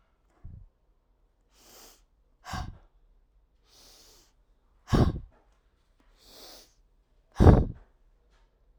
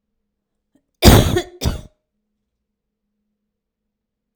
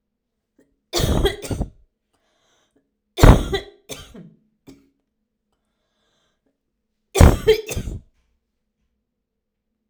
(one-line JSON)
{"exhalation_length": "8.8 s", "exhalation_amplitude": 30339, "exhalation_signal_mean_std_ratio": 0.21, "cough_length": "4.4 s", "cough_amplitude": 32768, "cough_signal_mean_std_ratio": 0.24, "three_cough_length": "9.9 s", "three_cough_amplitude": 32768, "three_cough_signal_mean_std_ratio": 0.25, "survey_phase": "alpha (2021-03-01 to 2021-08-12)", "age": "45-64", "gender": "Female", "wearing_mask": "No", "symptom_fatigue": true, "symptom_fever_high_temperature": true, "smoker_status": "Never smoked", "respiratory_condition_asthma": false, "respiratory_condition_other": false, "recruitment_source": "Test and Trace", "submission_delay": "1 day", "covid_test_result": "Positive", "covid_test_method": "RT-qPCR", "covid_ct_value": 29.7, "covid_ct_gene": "ORF1ab gene"}